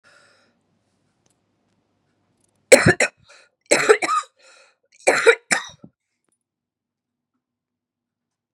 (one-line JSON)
{"three_cough_length": "8.5 s", "three_cough_amplitude": 32768, "three_cough_signal_mean_std_ratio": 0.25, "survey_phase": "beta (2021-08-13 to 2022-03-07)", "age": "45-64", "gender": "Female", "wearing_mask": "No", "symptom_cough_any": true, "symptom_runny_or_blocked_nose": true, "symptom_sore_throat": true, "smoker_status": "Ex-smoker", "respiratory_condition_asthma": false, "respiratory_condition_other": false, "recruitment_source": "Test and Trace", "submission_delay": "2 days", "covid_test_result": "Positive", "covid_test_method": "LFT"}